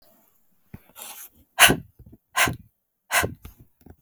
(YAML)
exhalation_length: 4.0 s
exhalation_amplitude: 32768
exhalation_signal_mean_std_ratio: 0.28
survey_phase: beta (2021-08-13 to 2022-03-07)
age: 18-44
gender: Female
wearing_mask: 'No'
symptom_cough_any: true
symptom_runny_or_blocked_nose: true
symptom_headache: true
smoker_status: Ex-smoker
respiratory_condition_asthma: false
respiratory_condition_other: false
recruitment_source: Test and Trace
submission_delay: 2 days
covid_test_result: Positive
covid_test_method: LFT